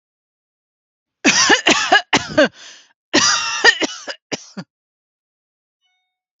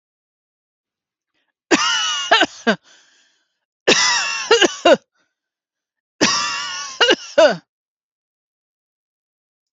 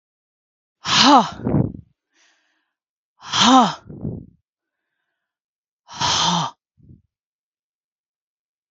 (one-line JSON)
{"cough_length": "6.4 s", "cough_amplitude": 32767, "cough_signal_mean_std_ratio": 0.4, "three_cough_length": "9.7 s", "three_cough_amplitude": 32767, "three_cough_signal_mean_std_ratio": 0.39, "exhalation_length": "8.7 s", "exhalation_amplitude": 29705, "exhalation_signal_mean_std_ratio": 0.34, "survey_phase": "alpha (2021-03-01 to 2021-08-12)", "age": "45-64", "gender": "Female", "wearing_mask": "No", "symptom_none": true, "smoker_status": "Never smoked", "respiratory_condition_asthma": false, "respiratory_condition_other": false, "recruitment_source": "REACT", "submission_delay": "1 day", "covid_test_result": "Negative", "covid_test_method": "RT-qPCR"}